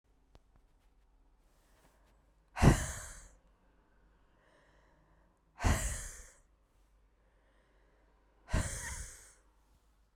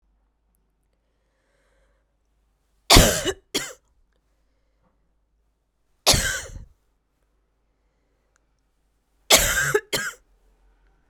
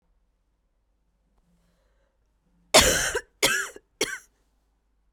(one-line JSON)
{"exhalation_length": "10.2 s", "exhalation_amplitude": 9036, "exhalation_signal_mean_std_ratio": 0.25, "three_cough_length": "11.1 s", "three_cough_amplitude": 32768, "three_cough_signal_mean_std_ratio": 0.25, "cough_length": "5.1 s", "cough_amplitude": 30500, "cough_signal_mean_std_ratio": 0.28, "survey_phase": "beta (2021-08-13 to 2022-03-07)", "age": "18-44", "gender": "Female", "wearing_mask": "No", "symptom_cough_any": true, "symptom_new_continuous_cough": true, "symptom_runny_or_blocked_nose": true, "symptom_shortness_of_breath": true, "symptom_fatigue": true, "symptom_fever_high_temperature": true, "symptom_headache": true, "symptom_change_to_sense_of_smell_or_taste": true, "symptom_loss_of_taste": true, "symptom_onset": "5 days", "smoker_status": "Never smoked", "respiratory_condition_asthma": false, "respiratory_condition_other": false, "recruitment_source": "Test and Trace", "submission_delay": "2 days", "covid_test_result": "Positive", "covid_test_method": "RT-qPCR", "covid_ct_value": 11.6, "covid_ct_gene": "N gene"}